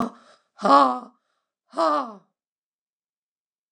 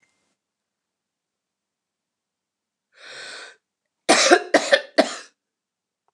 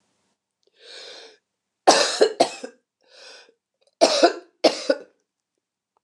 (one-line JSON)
{"exhalation_length": "3.7 s", "exhalation_amplitude": 25215, "exhalation_signal_mean_std_ratio": 0.33, "cough_length": "6.1 s", "cough_amplitude": 29170, "cough_signal_mean_std_ratio": 0.25, "three_cough_length": "6.0 s", "three_cough_amplitude": 28939, "three_cough_signal_mean_std_ratio": 0.31, "survey_phase": "beta (2021-08-13 to 2022-03-07)", "age": "65+", "gender": "Female", "wearing_mask": "No", "symptom_cough_any": true, "symptom_runny_or_blocked_nose": true, "smoker_status": "Ex-smoker", "respiratory_condition_asthma": false, "respiratory_condition_other": false, "recruitment_source": "Test and Trace", "submission_delay": "2 days", "covid_test_result": "Negative", "covid_test_method": "RT-qPCR"}